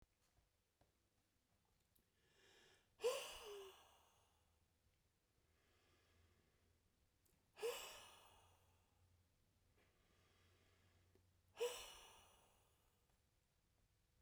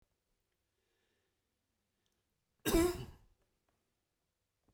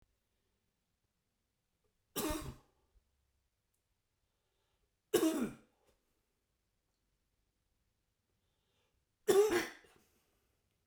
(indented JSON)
{
  "exhalation_length": "14.2 s",
  "exhalation_amplitude": 835,
  "exhalation_signal_mean_std_ratio": 0.28,
  "cough_length": "4.7 s",
  "cough_amplitude": 4235,
  "cough_signal_mean_std_ratio": 0.22,
  "three_cough_length": "10.9 s",
  "three_cough_amplitude": 4386,
  "three_cough_signal_mean_std_ratio": 0.24,
  "survey_phase": "beta (2021-08-13 to 2022-03-07)",
  "age": "45-64",
  "gender": "Male",
  "wearing_mask": "No",
  "symptom_none": true,
  "smoker_status": "Never smoked",
  "respiratory_condition_asthma": false,
  "respiratory_condition_other": false,
  "recruitment_source": "REACT",
  "submission_delay": "1 day",
  "covid_test_result": "Negative",
  "covid_test_method": "RT-qPCR"
}